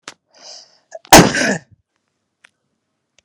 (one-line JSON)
{"cough_length": "3.2 s", "cough_amplitude": 32768, "cough_signal_mean_std_ratio": 0.25, "survey_phase": "beta (2021-08-13 to 2022-03-07)", "age": "18-44", "gender": "Female", "wearing_mask": "No", "symptom_none": true, "smoker_status": "Current smoker (11 or more cigarettes per day)", "respiratory_condition_asthma": false, "respiratory_condition_other": false, "recruitment_source": "REACT", "submission_delay": "2 days", "covid_test_result": "Negative", "covid_test_method": "RT-qPCR"}